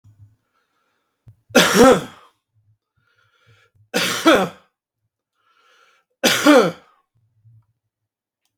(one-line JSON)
{"three_cough_length": "8.6 s", "three_cough_amplitude": 32767, "three_cough_signal_mean_std_ratio": 0.31, "survey_phase": "beta (2021-08-13 to 2022-03-07)", "age": "45-64", "gender": "Male", "wearing_mask": "No", "symptom_none": true, "smoker_status": "Never smoked", "respiratory_condition_asthma": false, "respiratory_condition_other": false, "recruitment_source": "REACT", "submission_delay": "1 day", "covid_test_result": "Negative", "covid_test_method": "RT-qPCR"}